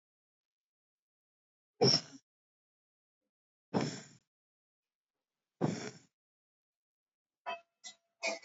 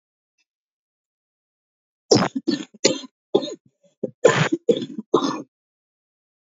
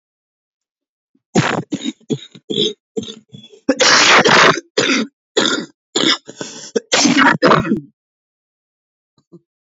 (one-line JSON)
{"exhalation_length": "8.4 s", "exhalation_amplitude": 5690, "exhalation_signal_mean_std_ratio": 0.23, "three_cough_length": "6.6 s", "three_cough_amplitude": 30852, "three_cough_signal_mean_std_ratio": 0.32, "cough_length": "9.7 s", "cough_amplitude": 32222, "cough_signal_mean_std_ratio": 0.47, "survey_phase": "beta (2021-08-13 to 2022-03-07)", "age": "45-64", "gender": "Female", "wearing_mask": "No", "symptom_cough_any": true, "symptom_runny_or_blocked_nose": true, "symptom_shortness_of_breath": true, "symptom_abdominal_pain": true, "symptom_diarrhoea": true, "symptom_fatigue": true, "symptom_headache": true, "symptom_onset": "12 days", "smoker_status": "Never smoked", "respiratory_condition_asthma": false, "respiratory_condition_other": false, "recruitment_source": "REACT", "submission_delay": "3 days", "covid_test_result": "Negative", "covid_test_method": "RT-qPCR", "influenza_a_test_result": "Negative", "influenza_b_test_result": "Negative"}